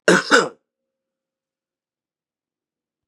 {"cough_length": "3.1 s", "cough_amplitude": 32758, "cough_signal_mean_std_ratio": 0.24, "survey_phase": "beta (2021-08-13 to 2022-03-07)", "age": "45-64", "gender": "Male", "wearing_mask": "No", "symptom_cough_any": true, "symptom_runny_or_blocked_nose": true, "symptom_shortness_of_breath": true, "symptom_sore_throat": true, "symptom_headache": true, "symptom_onset": "3 days", "smoker_status": "Ex-smoker", "respiratory_condition_asthma": false, "respiratory_condition_other": false, "recruitment_source": "Test and Trace", "submission_delay": "1 day", "covid_test_result": "Positive", "covid_test_method": "RT-qPCR", "covid_ct_value": 27.3, "covid_ct_gene": "N gene"}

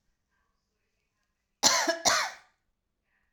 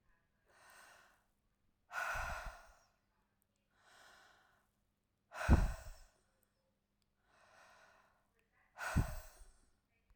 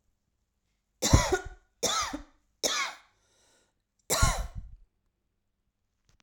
{"cough_length": "3.3 s", "cough_amplitude": 18600, "cough_signal_mean_std_ratio": 0.32, "exhalation_length": "10.2 s", "exhalation_amplitude": 5163, "exhalation_signal_mean_std_ratio": 0.26, "three_cough_length": "6.2 s", "three_cough_amplitude": 19611, "three_cough_signal_mean_std_ratio": 0.35, "survey_phase": "alpha (2021-03-01 to 2021-08-12)", "age": "45-64", "gender": "Female", "wearing_mask": "No", "symptom_none": true, "smoker_status": "Ex-smoker", "respiratory_condition_asthma": false, "respiratory_condition_other": false, "recruitment_source": "REACT", "submission_delay": "1 day", "covid_test_result": "Negative", "covid_test_method": "RT-qPCR"}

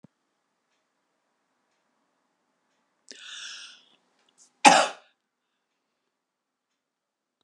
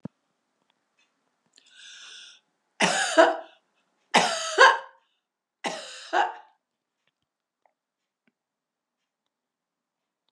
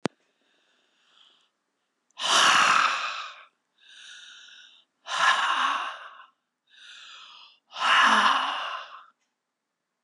{"cough_length": "7.4 s", "cough_amplitude": 31280, "cough_signal_mean_std_ratio": 0.15, "three_cough_length": "10.3 s", "three_cough_amplitude": 28512, "three_cough_signal_mean_std_ratio": 0.26, "exhalation_length": "10.0 s", "exhalation_amplitude": 14521, "exhalation_signal_mean_std_ratio": 0.44, "survey_phase": "beta (2021-08-13 to 2022-03-07)", "age": "65+", "gender": "Female", "wearing_mask": "No", "symptom_none": true, "smoker_status": "Ex-smoker", "respiratory_condition_asthma": false, "respiratory_condition_other": false, "recruitment_source": "REACT", "submission_delay": "2 days", "covid_test_result": "Negative", "covid_test_method": "RT-qPCR", "covid_ct_value": 39.0, "covid_ct_gene": "N gene"}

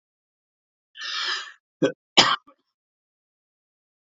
{"cough_length": "4.1 s", "cough_amplitude": 28874, "cough_signal_mean_std_ratio": 0.26, "survey_phase": "beta (2021-08-13 to 2022-03-07)", "age": "45-64", "gender": "Male", "wearing_mask": "No", "symptom_none": true, "smoker_status": "Ex-smoker", "respiratory_condition_asthma": false, "respiratory_condition_other": false, "recruitment_source": "REACT", "submission_delay": "11 days", "covid_test_result": "Negative", "covid_test_method": "RT-qPCR", "influenza_a_test_result": "Negative", "influenza_b_test_result": "Negative"}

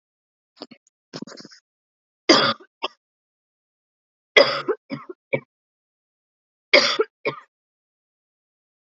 {"cough_length": "9.0 s", "cough_amplitude": 32090, "cough_signal_mean_std_ratio": 0.24, "survey_phase": "beta (2021-08-13 to 2022-03-07)", "age": "45-64", "gender": "Female", "wearing_mask": "No", "symptom_cough_any": true, "symptom_runny_or_blocked_nose": true, "symptom_sore_throat": true, "symptom_abdominal_pain": true, "symptom_fatigue": true, "symptom_fever_high_temperature": true, "symptom_headache": true, "symptom_onset": "3 days", "smoker_status": "Never smoked", "respiratory_condition_asthma": false, "respiratory_condition_other": false, "recruitment_source": "Test and Trace", "submission_delay": "2 days", "covid_test_result": "Positive", "covid_test_method": "RT-qPCR", "covid_ct_value": 19.3, "covid_ct_gene": "N gene", "covid_ct_mean": 19.3, "covid_viral_load": "460000 copies/ml", "covid_viral_load_category": "Low viral load (10K-1M copies/ml)"}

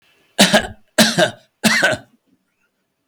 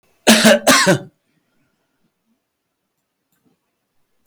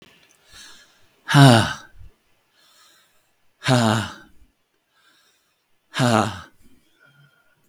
{"three_cough_length": "3.1 s", "three_cough_amplitude": 32768, "three_cough_signal_mean_std_ratio": 0.43, "cough_length": "4.3 s", "cough_amplitude": 32768, "cough_signal_mean_std_ratio": 0.32, "exhalation_length": "7.7 s", "exhalation_amplitude": 32768, "exhalation_signal_mean_std_ratio": 0.3, "survey_phase": "beta (2021-08-13 to 2022-03-07)", "age": "65+", "gender": "Male", "wearing_mask": "No", "symptom_cough_any": true, "symptom_runny_or_blocked_nose": true, "symptom_sore_throat": true, "symptom_headache": true, "symptom_onset": "2 days", "smoker_status": "Ex-smoker", "respiratory_condition_asthma": false, "respiratory_condition_other": false, "recruitment_source": "Test and Trace", "submission_delay": "1 day", "covid_test_result": "Positive", "covid_test_method": "RT-qPCR", "covid_ct_value": 33.8, "covid_ct_gene": "ORF1ab gene"}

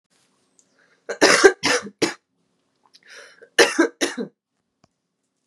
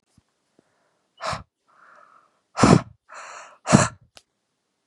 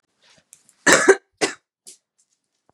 {"three_cough_length": "5.5 s", "three_cough_amplitude": 32767, "three_cough_signal_mean_std_ratio": 0.31, "exhalation_length": "4.9 s", "exhalation_amplitude": 32740, "exhalation_signal_mean_std_ratio": 0.24, "cough_length": "2.7 s", "cough_amplitude": 32768, "cough_signal_mean_std_ratio": 0.27, "survey_phase": "beta (2021-08-13 to 2022-03-07)", "age": "18-44", "gender": "Female", "wearing_mask": "No", "symptom_runny_or_blocked_nose": true, "symptom_shortness_of_breath": true, "symptom_sore_throat": true, "symptom_abdominal_pain": true, "symptom_fatigue": true, "symptom_headache": true, "symptom_other": true, "symptom_onset": "3 days", "smoker_status": "Current smoker (11 or more cigarettes per day)", "respiratory_condition_asthma": false, "respiratory_condition_other": false, "recruitment_source": "REACT", "submission_delay": "3 days", "covid_test_result": "Positive", "covid_test_method": "RT-qPCR", "covid_ct_value": 18.0, "covid_ct_gene": "E gene", "influenza_a_test_result": "Negative", "influenza_b_test_result": "Negative"}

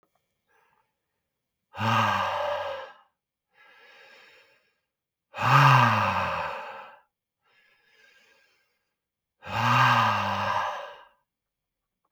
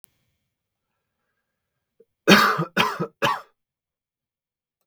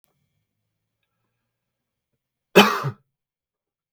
{"exhalation_length": "12.1 s", "exhalation_amplitude": 18419, "exhalation_signal_mean_std_ratio": 0.42, "three_cough_length": "4.9 s", "three_cough_amplitude": 32766, "three_cough_signal_mean_std_ratio": 0.28, "cough_length": "3.9 s", "cough_amplitude": 32768, "cough_signal_mean_std_ratio": 0.18, "survey_phase": "beta (2021-08-13 to 2022-03-07)", "age": "18-44", "gender": "Male", "wearing_mask": "No", "symptom_cough_any": true, "smoker_status": "Never smoked", "respiratory_condition_asthma": false, "respiratory_condition_other": false, "recruitment_source": "REACT", "submission_delay": "1 day", "covid_test_result": "Negative", "covid_test_method": "RT-qPCR", "influenza_a_test_result": "Unknown/Void", "influenza_b_test_result": "Unknown/Void"}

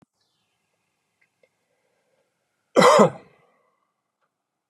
{"cough_length": "4.7 s", "cough_amplitude": 29314, "cough_signal_mean_std_ratio": 0.22, "survey_phase": "beta (2021-08-13 to 2022-03-07)", "age": "45-64", "gender": "Male", "wearing_mask": "No", "symptom_none": true, "smoker_status": "Never smoked", "respiratory_condition_asthma": false, "respiratory_condition_other": false, "recruitment_source": "REACT", "submission_delay": "2 days", "covid_test_result": "Negative", "covid_test_method": "RT-qPCR", "influenza_a_test_result": "Negative", "influenza_b_test_result": "Negative"}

